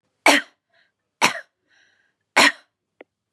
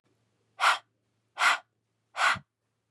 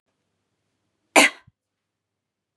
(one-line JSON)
{"three_cough_length": "3.3 s", "three_cough_amplitude": 32767, "three_cough_signal_mean_std_ratio": 0.27, "exhalation_length": "2.9 s", "exhalation_amplitude": 9640, "exhalation_signal_mean_std_ratio": 0.35, "cough_length": "2.6 s", "cough_amplitude": 32540, "cough_signal_mean_std_ratio": 0.17, "survey_phase": "beta (2021-08-13 to 2022-03-07)", "age": "18-44", "gender": "Female", "wearing_mask": "No", "symptom_none": true, "smoker_status": "Never smoked", "respiratory_condition_asthma": false, "respiratory_condition_other": false, "recruitment_source": "REACT", "submission_delay": "1 day", "covid_test_result": "Negative", "covid_test_method": "RT-qPCR", "influenza_a_test_result": "Negative", "influenza_b_test_result": "Negative"}